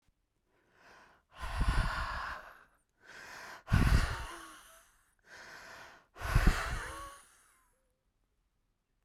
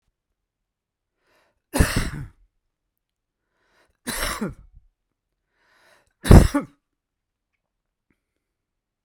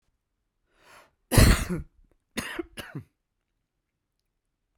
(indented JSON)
{
  "exhalation_length": "9.0 s",
  "exhalation_amplitude": 7806,
  "exhalation_signal_mean_std_ratio": 0.38,
  "three_cough_length": "9.0 s",
  "three_cough_amplitude": 32768,
  "three_cough_signal_mean_std_ratio": 0.19,
  "cough_length": "4.8 s",
  "cough_amplitude": 22554,
  "cough_signal_mean_std_ratio": 0.25,
  "survey_phase": "beta (2021-08-13 to 2022-03-07)",
  "age": "45-64",
  "gender": "Male",
  "wearing_mask": "No",
  "symptom_cough_any": true,
  "symptom_shortness_of_breath": true,
  "symptom_fatigue": true,
  "symptom_change_to_sense_of_smell_or_taste": true,
  "smoker_status": "Never smoked",
  "respiratory_condition_asthma": true,
  "respiratory_condition_other": false,
  "recruitment_source": "Test and Trace",
  "submission_delay": "2 days",
  "covid_test_result": "Positive",
  "covid_test_method": "RT-qPCR"
}